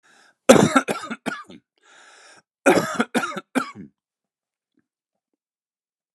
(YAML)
cough_length: 6.1 s
cough_amplitude: 32768
cough_signal_mean_std_ratio: 0.29
survey_phase: beta (2021-08-13 to 2022-03-07)
age: 45-64
gender: Male
wearing_mask: 'No'
symptom_none: true
symptom_onset: 12 days
smoker_status: Never smoked
respiratory_condition_asthma: false
respiratory_condition_other: false
recruitment_source: REACT
submission_delay: 2 days
covid_test_result: Negative
covid_test_method: RT-qPCR
influenza_a_test_result: Negative
influenza_b_test_result: Negative